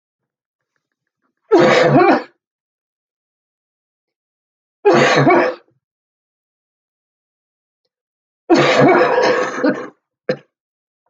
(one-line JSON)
{"three_cough_length": "11.1 s", "three_cough_amplitude": 31766, "three_cough_signal_mean_std_ratio": 0.41, "survey_phase": "beta (2021-08-13 to 2022-03-07)", "age": "45-64", "gender": "Female", "wearing_mask": "No", "symptom_cough_any": true, "smoker_status": "Never smoked", "respiratory_condition_asthma": false, "respiratory_condition_other": true, "recruitment_source": "REACT", "submission_delay": "3 days", "covid_test_result": "Negative", "covid_test_method": "RT-qPCR"}